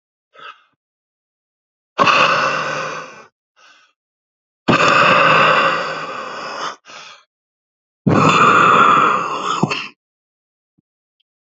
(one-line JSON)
{"exhalation_length": "11.4 s", "exhalation_amplitude": 32460, "exhalation_signal_mean_std_ratio": 0.51, "survey_phase": "beta (2021-08-13 to 2022-03-07)", "age": "45-64", "gender": "Male", "wearing_mask": "No", "symptom_cough_any": true, "symptom_runny_or_blocked_nose": true, "symptom_shortness_of_breath": true, "symptom_fatigue": true, "symptom_change_to_sense_of_smell_or_taste": true, "symptom_loss_of_taste": true, "symptom_onset": "5 days", "smoker_status": "Current smoker (11 or more cigarettes per day)", "respiratory_condition_asthma": false, "respiratory_condition_other": false, "recruitment_source": "Test and Trace", "submission_delay": "1 day", "covid_test_result": "Positive", "covid_test_method": "RT-qPCR", "covid_ct_value": 22.6, "covid_ct_gene": "ORF1ab gene", "covid_ct_mean": 23.5, "covid_viral_load": "20000 copies/ml", "covid_viral_load_category": "Low viral load (10K-1M copies/ml)"}